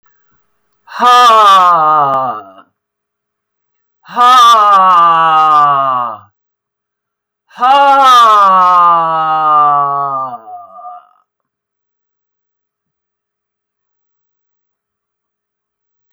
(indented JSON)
{
  "exhalation_length": "16.1 s",
  "exhalation_amplitude": 32768,
  "exhalation_signal_mean_std_ratio": 0.58,
  "survey_phase": "beta (2021-08-13 to 2022-03-07)",
  "age": "65+",
  "gender": "Female",
  "wearing_mask": "No",
  "symptom_cough_any": true,
  "symptom_runny_or_blocked_nose": true,
  "symptom_sore_throat": true,
  "symptom_fatigue": true,
  "symptom_headache": true,
  "smoker_status": "Never smoked",
  "respiratory_condition_asthma": false,
  "respiratory_condition_other": false,
  "recruitment_source": "Test and Trace",
  "submission_delay": "1 day",
  "covid_test_result": "Negative",
  "covid_test_method": "ePCR"
}